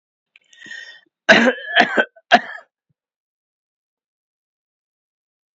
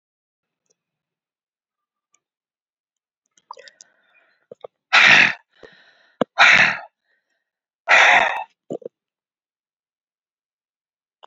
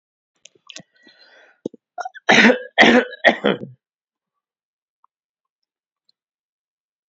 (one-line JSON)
{"cough_length": "5.5 s", "cough_amplitude": 29026, "cough_signal_mean_std_ratio": 0.26, "exhalation_length": "11.3 s", "exhalation_amplitude": 32768, "exhalation_signal_mean_std_ratio": 0.27, "three_cough_length": "7.1 s", "three_cough_amplitude": 29636, "three_cough_signal_mean_std_ratio": 0.27, "survey_phase": "beta (2021-08-13 to 2022-03-07)", "age": "65+", "gender": "Male", "wearing_mask": "No", "symptom_none": true, "smoker_status": "Ex-smoker", "respiratory_condition_asthma": false, "respiratory_condition_other": false, "recruitment_source": "REACT", "submission_delay": "1 day", "covid_test_result": "Negative", "covid_test_method": "RT-qPCR", "influenza_a_test_result": "Negative", "influenza_b_test_result": "Negative"}